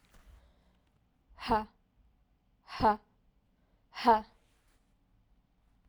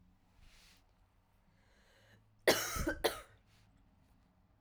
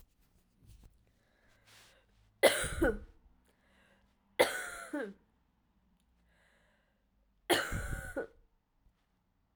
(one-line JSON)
{"exhalation_length": "5.9 s", "exhalation_amplitude": 8005, "exhalation_signal_mean_std_ratio": 0.25, "cough_length": "4.6 s", "cough_amplitude": 6401, "cough_signal_mean_std_ratio": 0.28, "three_cough_length": "9.6 s", "three_cough_amplitude": 9354, "three_cough_signal_mean_std_ratio": 0.29, "survey_phase": "beta (2021-08-13 to 2022-03-07)", "age": "18-44", "gender": "Female", "wearing_mask": "No", "symptom_runny_or_blocked_nose": true, "symptom_sore_throat": true, "symptom_fatigue": true, "symptom_fever_high_temperature": true, "symptom_headache": true, "symptom_change_to_sense_of_smell_or_taste": true, "symptom_other": true, "symptom_onset": "2 days", "smoker_status": "Never smoked", "respiratory_condition_asthma": false, "respiratory_condition_other": false, "recruitment_source": "Test and Trace", "submission_delay": "2 days", "covid_test_result": "Positive", "covid_test_method": "RT-qPCR", "covid_ct_value": 26.5, "covid_ct_gene": "ORF1ab gene"}